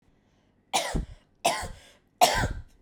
{
  "three_cough_length": "2.8 s",
  "three_cough_amplitude": 17574,
  "three_cough_signal_mean_std_ratio": 0.42,
  "survey_phase": "beta (2021-08-13 to 2022-03-07)",
  "age": "18-44",
  "gender": "Female",
  "wearing_mask": "No",
  "symptom_cough_any": true,
  "symptom_new_continuous_cough": true,
  "symptom_runny_or_blocked_nose": true,
  "symptom_other": true,
  "symptom_onset": "3 days",
  "smoker_status": "Never smoked",
  "respiratory_condition_asthma": true,
  "respiratory_condition_other": false,
  "recruitment_source": "Test and Trace",
  "submission_delay": "1 day",
  "covid_test_result": "Positive",
  "covid_test_method": "RT-qPCR",
  "covid_ct_value": 31.5,
  "covid_ct_gene": "N gene"
}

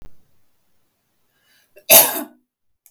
{
  "cough_length": "2.9 s",
  "cough_amplitude": 32768,
  "cough_signal_mean_std_ratio": 0.24,
  "survey_phase": "beta (2021-08-13 to 2022-03-07)",
  "age": "45-64",
  "gender": "Female",
  "wearing_mask": "No",
  "symptom_none": true,
  "smoker_status": "Never smoked",
  "respiratory_condition_asthma": false,
  "respiratory_condition_other": false,
  "recruitment_source": "REACT",
  "submission_delay": "1 day",
  "covid_test_result": "Negative",
  "covid_test_method": "RT-qPCR",
  "influenza_a_test_result": "Negative",
  "influenza_b_test_result": "Negative"
}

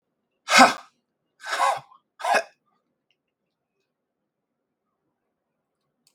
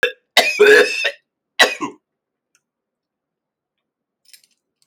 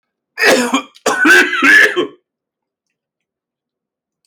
{
  "exhalation_length": "6.1 s",
  "exhalation_amplitude": 29073,
  "exhalation_signal_mean_std_ratio": 0.24,
  "three_cough_length": "4.9 s",
  "three_cough_amplitude": 31426,
  "three_cough_signal_mean_std_ratio": 0.32,
  "cough_length": "4.3 s",
  "cough_amplitude": 31101,
  "cough_signal_mean_std_ratio": 0.47,
  "survey_phase": "alpha (2021-03-01 to 2021-08-12)",
  "age": "45-64",
  "gender": "Male",
  "wearing_mask": "No",
  "symptom_none": true,
  "smoker_status": "Never smoked",
  "respiratory_condition_asthma": false,
  "respiratory_condition_other": false,
  "recruitment_source": "REACT",
  "submission_delay": "3 days",
  "covid_test_result": "Negative",
  "covid_test_method": "RT-qPCR"
}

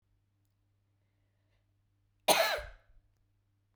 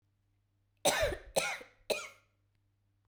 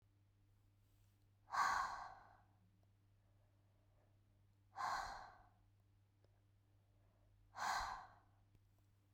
{
  "cough_length": "3.8 s",
  "cough_amplitude": 10722,
  "cough_signal_mean_std_ratio": 0.23,
  "three_cough_length": "3.1 s",
  "three_cough_amplitude": 6512,
  "three_cough_signal_mean_std_ratio": 0.37,
  "exhalation_length": "9.1 s",
  "exhalation_amplitude": 1368,
  "exhalation_signal_mean_std_ratio": 0.36,
  "survey_phase": "beta (2021-08-13 to 2022-03-07)",
  "age": "18-44",
  "gender": "Female",
  "wearing_mask": "No",
  "symptom_runny_or_blocked_nose": true,
  "symptom_loss_of_taste": true,
  "smoker_status": "Current smoker (1 to 10 cigarettes per day)",
  "respiratory_condition_asthma": false,
  "respiratory_condition_other": false,
  "recruitment_source": "Test and Trace",
  "submission_delay": "2 days",
  "covid_test_result": "Positive",
  "covid_test_method": "RT-qPCR",
  "covid_ct_value": 28.8,
  "covid_ct_gene": "ORF1ab gene"
}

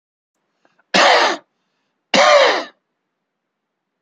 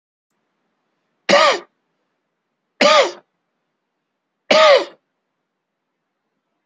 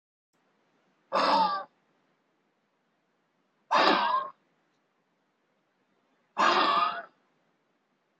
{
  "cough_length": "4.0 s",
  "cough_amplitude": 29334,
  "cough_signal_mean_std_ratio": 0.39,
  "three_cough_length": "6.7 s",
  "three_cough_amplitude": 30989,
  "three_cough_signal_mean_std_ratio": 0.3,
  "exhalation_length": "8.2 s",
  "exhalation_amplitude": 14460,
  "exhalation_signal_mean_std_ratio": 0.37,
  "survey_phase": "alpha (2021-03-01 to 2021-08-12)",
  "age": "65+",
  "gender": "Male",
  "wearing_mask": "No",
  "symptom_none": true,
  "smoker_status": "Never smoked",
  "respiratory_condition_asthma": true,
  "respiratory_condition_other": false,
  "recruitment_source": "REACT",
  "submission_delay": "1 day",
  "covid_test_result": "Negative",
  "covid_test_method": "RT-qPCR"
}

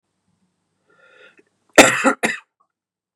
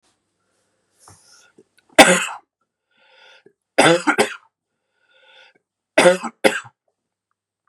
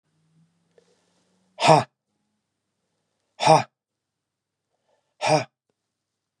{
  "cough_length": "3.2 s",
  "cough_amplitude": 32768,
  "cough_signal_mean_std_ratio": 0.25,
  "three_cough_length": "7.7 s",
  "three_cough_amplitude": 32768,
  "three_cough_signal_mean_std_ratio": 0.27,
  "exhalation_length": "6.4 s",
  "exhalation_amplitude": 29522,
  "exhalation_signal_mean_std_ratio": 0.23,
  "survey_phase": "beta (2021-08-13 to 2022-03-07)",
  "age": "45-64",
  "gender": "Male",
  "wearing_mask": "No",
  "symptom_cough_any": true,
  "symptom_runny_or_blocked_nose": true,
  "symptom_fever_high_temperature": true,
  "symptom_headache": true,
  "symptom_change_to_sense_of_smell_or_taste": true,
  "symptom_onset": "2 days",
  "smoker_status": "Never smoked",
  "respiratory_condition_asthma": false,
  "respiratory_condition_other": false,
  "recruitment_source": "Test and Trace",
  "submission_delay": "2 days",
  "covid_test_result": "Positive",
  "covid_test_method": "RT-qPCR",
  "covid_ct_value": 13.7,
  "covid_ct_gene": "ORF1ab gene",
  "covid_ct_mean": 13.9,
  "covid_viral_load": "27000000 copies/ml",
  "covid_viral_load_category": "High viral load (>1M copies/ml)"
}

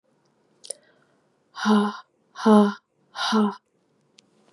{
  "exhalation_length": "4.5 s",
  "exhalation_amplitude": 23778,
  "exhalation_signal_mean_std_ratio": 0.36,
  "survey_phase": "beta (2021-08-13 to 2022-03-07)",
  "age": "18-44",
  "gender": "Female",
  "wearing_mask": "No",
  "symptom_cough_any": true,
  "symptom_new_continuous_cough": true,
  "symptom_runny_or_blocked_nose": true,
  "symptom_shortness_of_breath": true,
  "symptom_abdominal_pain": true,
  "symptom_fatigue": true,
  "symptom_fever_high_temperature": true,
  "symptom_headache": true,
  "symptom_onset": "5 days",
  "smoker_status": "Never smoked",
  "respiratory_condition_asthma": false,
  "respiratory_condition_other": false,
  "recruitment_source": "Test and Trace",
  "submission_delay": "2 days",
  "covid_test_result": "Positive",
  "covid_test_method": "RT-qPCR",
  "covid_ct_value": 11.4,
  "covid_ct_gene": "ORF1ab gene"
}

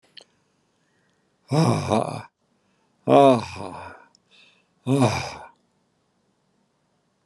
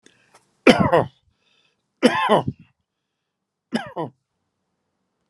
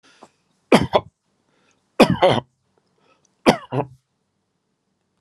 {
  "exhalation_length": "7.3 s",
  "exhalation_amplitude": 29662,
  "exhalation_signal_mean_std_ratio": 0.33,
  "cough_length": "5.3 s",
  "cough_amplitude": 32767,
  "cough_signal_mean_std_ratio": 0.29,
  "three_cough_length": "5.2 s",
  "three_cough_amplitude": 32767,
  "three_cough_signal_mean_std_ratio": 0.26,
  "survey_phase": "alpha (2021-03-01 to 2021-08-12)",
  "age": "65+",
  "gender": "Male",
  "wearing_mask": "No",
  "symptom_none": true,
  "smoker_status": "Never smoked",
  "respiratory_condition_asthma": false,
  "respiratory_condition_other": false,
  "recruitment_source": "REACT",
  "submission_delay": "2 days",
  "covid_test_result": "Negative",
  "covid_test_method": "RT-qPCR"
}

